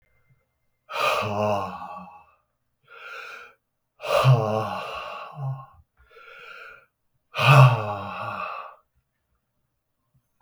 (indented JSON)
{
  "exhalation_length": "10.4 s",
  "exhalation_amplitude": 28926,
  "exhalation_signal_mean_std_ratio": 0.38,
  "survey_phase": "beta (2021-08-13 to 2022-03-07)",
  "age": "45-64",
  "gender": "Male",
  "wearing_mask": "No",
  "symptom_cough_any": true,
  "symptom_runny_or_blocked_nose": true,
  "symptom_sore_throat": true,
  "symptom_fatigue": true,
  "symptom_headache": true,
  "symptom_onset": "3 days",
  "smoker_status": "Ex-smoker",
  "respiratory_condition_asthma": false,
  "respiratory_condition_other": false,
  "recruitment_source": "Test and Trace",
  "submission_delay": "2 days",
  "covid_test_result": "Positive",
  "covid_test_method": "RT-qPCR",
  "covid_ct_value": 22.1,
  "covid_ct_gene": "N gene"
}